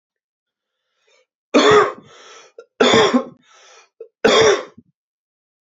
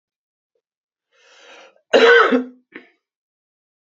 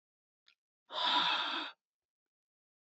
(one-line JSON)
{"three_cough_length": "5.6 s", "three_cough_amplitude": 32767, "three_cough_signal_mean_std_ratio": 0.38, "cough_length": "3.9 s", "cough_amplitude": 28557, "cough_signal_mean_std_ratio": 0.29, "exhalation_length": "3.0 s", "exhalation_amplitude": 3636, "exhalation_signal_mean_std_ratio": 0.41, "survey_phase": "beta (2021-08-13 to 2022-03-07)", "age": "18-44", "gender": "Male", "wearing_mask": "No", "symptom_runny_or_blocked_nose": true, "symptom_sore_throat": true, "symptom_fatigue": true, "symptom_headache": true, "symptom_change_to_sense_of_smell_or_taste": true, "smoker_status": "Never smoked", "respiratory_condition_asthma": true, "respiratory_condition_other": false, "recruitment_source": "Test and Trace", "submission_delay": "2 days", "covid_test_result": "Positive", "covid_test_method": "RT-qPCR", "covid_ct_value": 22.6, "covid_ct_gene": "ORF1ab gene", "covid_ct_mean": 23.2, "covid_viral_load": "25000 copies/ml", "covid_viral_load_category": "Low viral load (10K-1M copies/ml)"}